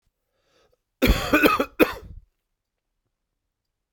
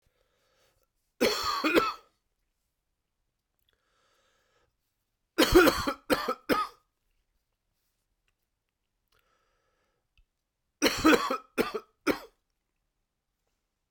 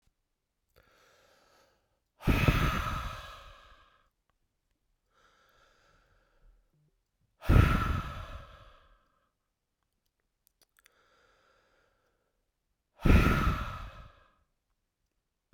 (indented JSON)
{
  "cough_length": "3.9 s",
  "cough_amplitude": 26425,
  "cough_signal_mean_std_ratio": 0.31,
  "three_cough_length": "13.9 s",
  "three_cough_amplitude": 13557,
  "three_cough_signal_mean_std_ratio": 0.29,
  "exhalation_length": "15.5 s",
  "exhalation_amplitude": 11520,
  "exhalation_signal_mean_std_ratio": 0.28,
  "survey_phase": "beta (2021-08-13 to 2022-03-07)",
  "age": "45-64",
  "gender": "Male",
  "wearing_mask": "No",
  "symptom_cough_any": true,
  "symptom_new_continuous_cough": true,
  "symptom_runny_or_blocked_nose": true,
  "symptom_shortness_of_breath": true,
  "symptom_fatigue": true,
  "symptom_fever_high_temperature": true,
  "symptom_headache": true,
  "symptom_other": true,
  "symptom_onset": "3 days",
  "smoker_status": "Ex-smoker",
  "respiratory_condition_asthma": false,
  "respiratory_condition_other": false,
  "recruitment_source": "Test and Trace",
  "submission_delay": "1 day",
  "covid_test_result": "Positive",
  "covid_test_method": "RT-qPCR",
  "covid_ct_value": 16.9,
  "covid_ct_gene": "ORF1ab gene",
  "covid_ct_mean": 18.0,
  "covid_viral_load": "1300000 copies/ml",
  "covid_viral_load_category": "High viral load (>1M copies/ml)"
}